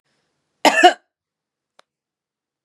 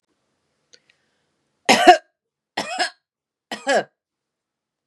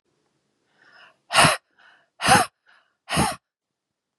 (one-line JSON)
{"cough_length": "2.6 s", "cough_amplitude": 32754, "cough_signal_mean_std_ratio": 0.23, "three_cough_length": "4.9 s", "three_cough_amplitude": 32767, "three_cough_signal_mean_std_ratio": 0.25, "exhalation_length": "4.2 s", "exhalation_amplitude": 26816, "exhalation_signal_mean_std_ratio": 0.31, "survey_phase": "beta (2021-08-13 to 2022-03-07)", "age": "45-64", "gender": "Female", "wearing_mask": "No", "symptom_none": true, "symptom_onset": "2 days", "smoker_status": "Ex-smoker", "respiratory_condition_asthma": false, "respiratory_condition_other": false, "recruitment_source": "Test and Trace", "submission_delay": "2 days", "covid_test_result": "Negative", "covid_test_method": "RT-qPCR"}